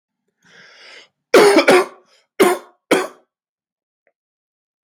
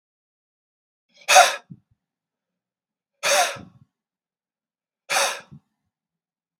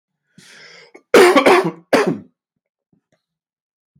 {
  "three_cough_length": "4.8 s",
  "three_cough_amplitude": 32768,
  "three_cough_signal_mean_std_ratio": 0.32,
  "exhalation_length": "6.6 s",
  "exhalation_amplitude": 32768,
  "exhalation_signal_mean_std_ratio": 0.25,
  "cough_length": "4.0 s",
  "cough_amplitude": 32768,
  "cough_signal_mean_std_ratio": 0.34,
  "survey_phase": "beta (2021-08-13 to 2022-03-07)",
  "age": "18-44",
  "gender": "Male",
  "wearing_mask": "No",
  "symptom_runny_or_blocked_nose": true,
  "symptom_sore_throat": true,
  "smoker_status": "Never smoked",
  "respiratory_condition_asthma": false,
  "respiratory_condition_other": false,
  "recruitment_source": "Test and Trace",
  "submission_delay": "2 days",
  "covid_test_result": "Positive",
  "covid_test_method": "RT-qPCR",
  "covid_ct_value": 18.6,
  "covid_ct_gene": "ORF1ab gene"
}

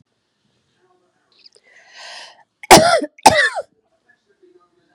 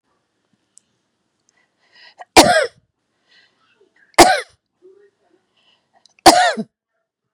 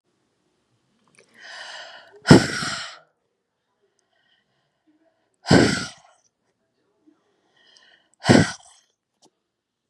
{
  "cough_length": "4.9 s",
  "cough_amplitude": 32768,
  "cough_signal_mean_std_ratio": 0.27,
  "three_cough_length": "7.3 s",
  "three_cough_amplitude": 32768,
  "three_cough_signal_mean_std_ratio": 0.25,
  "exhalation_length": "9.9 s",
  "exhalation_amplitude": 32768,
  "exhalation_signal_mean_std_ratio": 0.22,
  "survey_phase": "beta (2021-08-13 to 2022-03-07)",
  "age": "45-64",
  "gender": "Female",
  "wearing_mask": "No",
  "symptom_headache": true,
  "symptom_other": true,
  "symptom_onset": "7 days",
  "smoker_status": "Never smoked",
  "respiratory_condition_asthma": false,
  "respiratory_condition_other": false,
  "recruitment_source": "Test and Trace",
  "submission_delay": "5 days",
  "covid_test_result": "Negative",
  "covid_test_method": "RT-qPCR"
}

